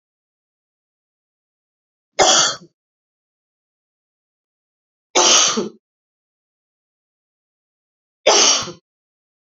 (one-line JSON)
{"three_cough_length": "9.6 s", "three_cough_amplitude": 32768, "three_cough_signal_mean_std_ratio": 0.28, "survey_phase": "beta (2021-08-13 to 2022-03-07)", "age": "45-64", "gender": "Female", "wearing_mask": "No", "symptom_cough_any": true, "symptom_runny_or_blocked_nose": true, "symptom_sore_throat": true, "symptom_onset": "3 days", "smoker_status": "Never smoked", "respiratory_condition_asthma": false, "respiratory_condition_other": false, "recruitment_source": "Test and Trace", "submission_delay": "1 day", "covid_test_result": "Positive", "covid_test_method": "RT-qPCR"}